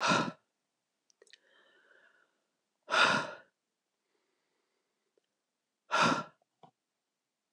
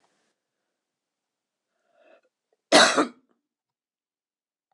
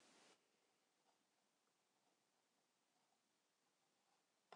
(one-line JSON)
{"exhalation_length": "7.5 s", "exhalation_amplitude": 7239, "exhalation_signal_mean_std_ratio": 0.29, "three_cough_length": "4.7 s", "three_cough_amplitude": 25269, "three_cough_signal_mean_std_ratio": 0.2, "cough_length": "4.6 s", "cough_amplitude": 165, "cough_signal_mean_std_ratio": 0.51, "survey_phase": "beta (2021-08-13 to 2022-03-07)", "age": "65+", "gender": "Female", "wearing_mask": "No", "symptom_cough_any": true, "symptom_runny_or_blocked_nose": true, "symptom_sore_throat": true, "symptom_fatigue": true, "symptom_headache": true, "symptom_other": true, "symptom_onset": "3 days", "smoker_status": "Never smoked", "respiratory_condition_asthma": false, "respiratory_condition_other": false, "recruitment_source": "Test and Trace", "submission_delay": "1 day", "covid_test_result": "Positive", "covid_test_method": "RT-qPCR", "covid_ct_value": 22.4, "covid_ct_gene": "N gene"}